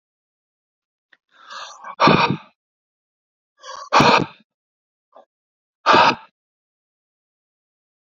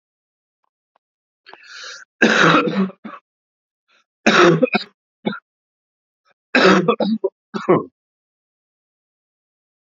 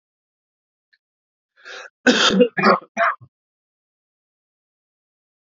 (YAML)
exhalation_length: 8.0 s
exhalation_amplitude: 28213
exhalation_signal_mean_std_ratio: 0.29
three_cough_length: 10.0 s
three_cough_amplitude: 32620
three_cough_signal_mean_std_ratio: 0.36
cough_length: 5.5 s
cough_amplitude: 30096
cough_signal_mean_std_ratio: 0.3
survey_phase: beta (2021-08-13 to 2022-03-07)
age: 18-44
gender: Male
wearing_mask: 'No'
symptom_cough_any: true
symptom_runny_or_blocked_nose: true
symptom_onset: 4 days
smoker_status: Never smoked
respiratory_condition_asthma: false
respiratory_condition_other: false
recruitment_source: REACT
submission_delay: 3 days
covid_test_result: Negative
covid_test_method: RT-qPCR